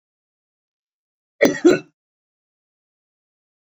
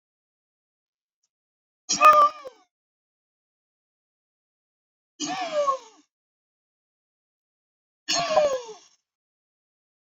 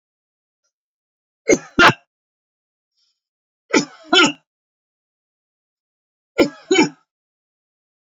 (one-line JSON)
{"cough_length": "3.8 s", "cough_amplitude": 28037, "cough_signal_mean_std_ratio": 0.2, "exhalation_length": "10.2 s", "exhalation_amplitude": 21080, "exhalation_signal_mean_std_ratio": 0.27, "three_cough_length": "8.2 s", "three_cough_amplitude": 32767, "three_cough_signal_mean_std_ratio": 0.24, "survey_phase": "beta (2021-08-13 to 2022-03-07)", "age": "65+", "gender": "Male", "wearing_mask": "No", "symptom_none": true, "smoker_status": "Never smoked", "respiratory_condition_asthma": true, "respiratory_condition_other": false, "recruitment_source": "REACT", "submission_delay": "2 days", "covid_test_result": "Negative", "covid_test_method": "RT-qPCR"}